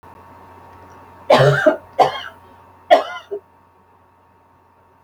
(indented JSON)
{
  "three_cough_length": "5.0 s",
  "three_cough_amplitude": 29172,
  "three_cough_signal_mean_std_ratio": 0.34,
  "survey_phase": "alpha (2021-03-01 to 2021-08-12)",
  "age": "45-64",
  "gender": "Female",
  "wearing_mask": "No",
  "symptom_none": true,
  "smoker_status": "Never smoked",
  "respiratory_condition_asthma": false,
  "respiratory_condition_other": false,
  "recruitment_source": "REACT",
  "submission_delay": "4 days",
  "covid_test_result": "Negative",
  "covid_test_method": "RT-qPCR"
}